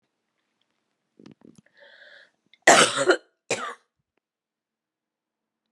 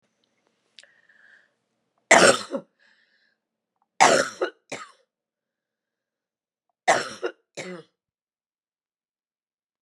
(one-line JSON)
{"cough_length": "5.7 s", "cough_amplitude": 29733, "cough_signal_mean_std_ratio": 0.23, "three_cough_length": "9.8 s", "three_cough_amplitude": 31135, "three_cough_signal_mean_std_ratio": 0.23, "survey_phase": "beta (2021-08-13 to 2022-03-07)", "age": "45-64", "gender": "Female", "wearing_mask": "No", "symptom_none": true, "smoker_status": "Ex-smoker", "respiratory_condition_asthma": false, "respiratory_condition_other": false, "recruitment_source": "REACT", "submission_delay": "1 day", "covid_test_result": "Negative", "covid_test_method": "RT-qPCR", "influenza_a_test_result": "Unknown/Void", "influenza_b_test_result": "Unknown/Void"}